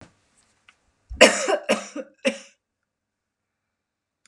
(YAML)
cough_length: 4.3 s
cough_amplitude: 32768
cough_signal_mean_std_ratio: 0.25
survey_phase: beta (2021-08-13 to 2022-03-07)
age: 65+
gender: Female
wearing_mask: 'No'
symptom_cough_any: true
symptom_runny_or_blocked_nose: true
symptom_change_to_sense_of_smell_or_taste: true
symptom_onset: 6 days
smoker_status: Never smoked
respiratory_condition_asthma: false
respiratory_condition_other: false
recruitment_source: REACT
submission_delay: 2 days
covid_test_result: Negative
covid_test_method: RT-qPCR
influenza_a_test_result: Negative
influenza_b_test_result: Negative